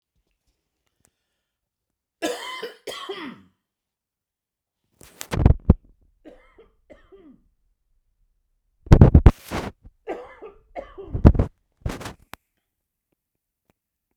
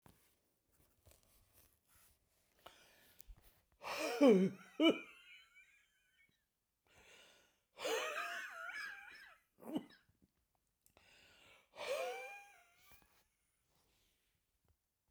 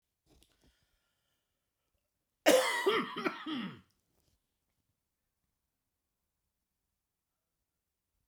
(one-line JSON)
{"three_cough_length": "14.2 s", "three_cough_amplitude": 32768, "three_cough_signal_mean_std_ratio": 0.2, "exhalation_length": "15.1 s", "exhalation_amplitude": 3957, "exhalation_signal_mean_std_ratio": 0.27, "cough_length": "8.3 s", "cough_amplitude": 8793, "cough_signal_mean_std_ratio": 0.25, "survey_phase": "beta (2021-08-13 to 2022-03-07)", "age": "65+", "gender": "Male", "wearing_mask": "No", "symptom_none": true, "smoker_status": "Never smoked", "respiratory_condition_asthma": false, "respiratory_condition_other": false, "recruitment_source": "REACT", "submission_delay": "1 day", "covid_test_result": "Negative", "covid_test_method": "RT-qPCR"}